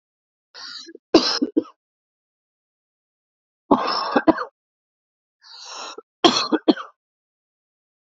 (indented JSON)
{
  "three_cough_length": "8.2 s",
  "three_cough_amplitude": 32768,
  "three_cough_signal_mean_std_ratio": 0.29,
  "survey_phase": "alpha (2021-03-01 to 2021-08-12)",
  "age": "18-44",
  "gender": "Male",
  "wearing_mask": "No",
  "symptom_cough_any": true,
  "symptom_fatigue": true,
  "symptom_headache": true,
  "symptom_onset": "3 days",
  "smoker_status": "Ex-smoker",
  "respiratory_condition_asthma": false,
  "respiratory_condition_other": false,
  "recruitment_source": "Test and Trace",
  "submission_delay": "1 day",
  "covid_test_result": "Positive",
  "covid_test_method": "RT-qPCR"
}